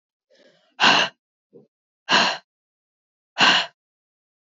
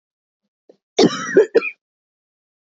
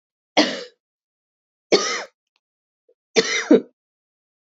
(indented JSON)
{
  "exhalation_length": "4.4 s",
  "exhalation_amplitude": 25787,
  "exhalation_signal_mean_std_ratio": 0.34,
  "cough_length": "2.6 s",
  "cough_amplitude": 26709,
  "cough_signal_mean_std_ratio": 0.31,
  "three_cough_length": "4.5 s",
  "three_cough_amplitude": 29202,
  "three_cough_signal_mean_std_ratio": 0.3,
  "survey_phase": "beta (2021-08-13 to 2022-03-07)",
  "age": "45-64",
  "gender": "Female",
  "wearing_mask": "No",
  "symptom_cough_any": true,
  "symptom_runny_or_blocked_nose": true,
  "symptom_shortness_of_breath": true,
  "symptom_sore_throat": true,
  "symptom_fatigue": true,
  "symptom_fever_high_temperature": true,
  "symptom_headache": true,
  "symptom_change_to_sense_of_smell_or_taste": true,
  "symptom_loss_of_taste": true,
  "symptom_onset": "2 days",
  "smoker_status": "Current smoker (e-cigarettes or vapes only)",
  "respiratory_condition_asthma": false,
  "respiratory_condition_other": false,
  "recruitment_source": "Test and Trace",
  "submission_delay": "1 day",
  "covid_test_result": "Positive",
  "covid_test_method": "ePCR"
}